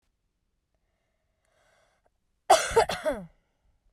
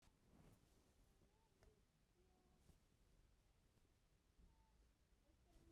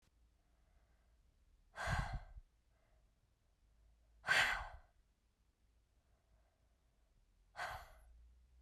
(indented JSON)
{
  "cough_length": "3.9 s",
  "cough_amplitude": 17206,
  "cough_signal_mean_std_ratio": 0.26,
  "three_cough_length": "5.7 s",
  "three_cough_amplitude": 54,
  "three_cough_signal_mean_std_ratio": 0.99,
  "exhalation_length": "8.6 s",
  "exhalation_amplitude": 2636,
  "exhalation_signal_mean_std_ratio": 0.3,
  "survey_phase": "beta (2021-08-13 to 2022-03-07)",
  "age": "18-44",
  "gender": "Female",
  "wearing_mask": "No",
  "symptom_none": true,
  "smoker_status": "Never smoked",
  "respiratory_condition_asthma": false,
  "respiratory_condition_other": false,
  "recruitment_source": "REACT",
  "submission_delay": "2 days",
  "covid_test_result": "Negative",
  "covid_test_method": "RT-qPCR"
}